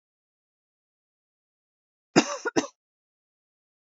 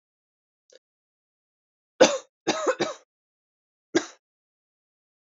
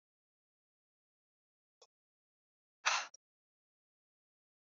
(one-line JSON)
{"cough_length": "3.8 s", "cough_amplitude": 23612, "cough_signal_mean_std_ratio": 0.18, "three_cough_length": "5.4 s", "three_cough_amplitude": 24829, "three_cough_signal_mean_std_ratio": 0.22, "exhalation_length": "4.8 s", "exhalation_amplitude": 5502, "exhalation_signal_mean_std_ratio": 0.15, "survey_phase": "alpha (2021-03-01 to 2021-08-12)", "age": "18-44", "gender": "Female", "wearing_mask": "No", "symptom_cough_any": true, "symptom_new_continuous_cough": true, "symptom_diarrhoea": true, "symptom_fatigue": true, "symptom_fever_high_temperature": true, "symptom_headache": true, "symptom_change_to_sense_of_smell_or_taste": true, "symptom_loss_of_taste": true, "smoker_status": "Never smoked", "respiratory_condition_asthma": true, "respiratory_condition_other": false, "recruitment_source": "Test and Trace", "submission_delay": "2 days", "covid_test_result": "Positive", "covid_test_method": "RT-qPCR"}